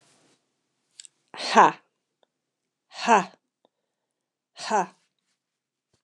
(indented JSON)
{
  "exhalation_length": "6.0 s",
  "exhalation_amplitude": 27550,
  "exhalation_signal_mean_std_ratio": 0.23,
  "survey_phase": "beta (2021-08-13 to 2022-03-07)",
  "age": "45-64",
  "gender": "Female",
  "wearing_mask": "No",
  "symptom_runny_or_blocked_nose": true,
  "smoker_status": "Never smoked",
  "respiratory_condition_asthma": false,
  "respiratory_condition_other": false,
  "recruitment_source": "REACT",
  "submission_delay": "1 day",
  "covid_test_result": "Negative",
  "covid_test_method": "RT-qPCR",
  "influenza_a_test_result": "Negative",
  "influenza_b_test_result": "Negative"
}